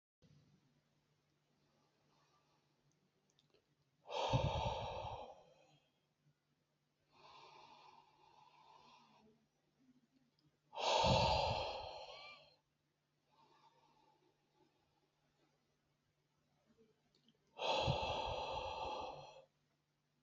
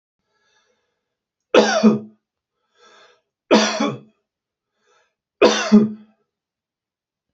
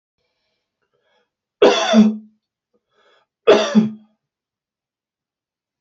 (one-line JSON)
{"exhalation_length": "20.2 s", "exhalation_amplitude": 3083, "exhalation_signal_mean_std_ratio": 0.36, "three_cough_length": "7.3 s", "three_cough_amplitude": 30283, "three_cough_signal_mean_std_ratio": 0.32, "cough_length": "5.8 s", "cough_amplitude": 29995, "cough_signal_mean_std_ratio": 0.31, "survey_phase": "beta (2021-08-13 to 2022-03-07)", "age": "45-64", "gender": "Male", "wearing_mask": "No", "symptom_none": true, "smoker_status": "Ex-smoker", "respiratory_condition_asthma": false, "respiratory_condition_other": false, "recruitment_source": "REACT", "submission_delay": "1 day", "covid_test_result": "Negative", "covid_test_method": "RT-qPCR"}